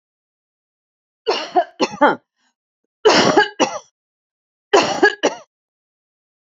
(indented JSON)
{
  "three_cough_length": "6.5 s",
  "three_cough_amplitude": 29149,
  "three_cough_signal_mean_std_ratio": 0.37,
  "survey_phase": "beta (2021-08-13 to 2022-03-07)",
  "age": "65+",
  "gender": "Female",
  "wearing_mask": "No",
  "symptom_none": true,
  "symptom_onset": "11 days",
  "smoker_status": "Ex-smoker",
  "respiratory_condition_asthma": false,
  "respiratory_condition_other": false,
  "recruitment_source": "REACT",
  "submission_delay": "2 days",
  "covid_test_result": "Negative",
  "covid_test_method": "RT-qPCR",
  "covid_ct_value": 38.0,
  "covid_ct_gene": "N gene",
  "influenza_a_test_result": "Negative",
  "influenza_b_test_result": "Negative"
}